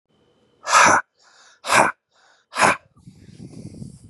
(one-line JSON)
{"exhalation_length": "4.1 s", "exhalation_amplitude": 31174, "exhalation_signal_mean_std_ratio": 0.36, "survey_phase": "beta (2021-08-13 to 2022-03-07)", "age": "18-44", "gender": "Male", "wearing_mask": "No", "symptom_none": true, "smoker_status": "Ex-smoker", "respiratory_condition_asthma": false, "respiratory_condition_other": false, "recruitment_source": "REACT", "submission_delay": "4 days", "covid_test_result": "Negative", "covid_test_method": "RT-qPCR", "influenza_a_test_result": "Negative", "influenza_b_test_result": "Negative"}